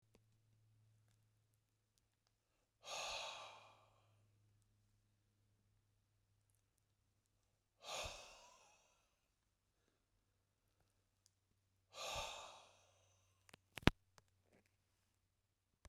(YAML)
exhalation_length: 15.9 s
exhalation_amplitude: 13377
exhalation_signal_mean_std_ratio: 0.19
survey_phase: beta (2021-08-13 to 2022-03-07)
age: 45-64
gender: Male
wearing_mask: 'No'
symptom_fatigue: true
symptom_headache: true
smoker_status: Ex-smoker
respiratory_condition_asthma: false
respiratory_condition_other: false
recruitment_source: REACT
submission_delay: 1 day
covid_test_result: Positive
covid_test_method: RT-qPCR
covid_ct_value: 29.0
covid_ct_gene: E gene